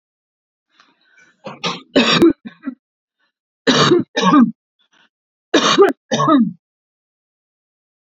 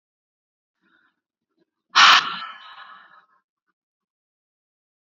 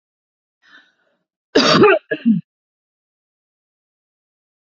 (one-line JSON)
{"three_cough_length": "8.0 s", "three_cough_amplitude": 30161, "three_cough_signal_mean_std_ratio": 0.41, "exhalation_length": "5.0 s", "exhalation_amplitude": 27556, "exhalation_signal_mean_std_ratio": 0.21, "cough_length": "4.7 s", "cough_amplitude": 32062, "cough_signal_mean_std_ratio": 0.3, "survey_phase": "beta (2021-08-13 to 2022-03-07)", "age": "45-64", "gender": "Female", "wearing_mask": "No", "symptom_none": true, "smoker_status": "Never smoked", "respiratory_condition_asthma": true, "respiratory_condition_other": false, "recruitment_source": "REACT", "submission_delay": "1 day", "covid_test_result": "Negative", "covid_test_method": "RT-qPCR"}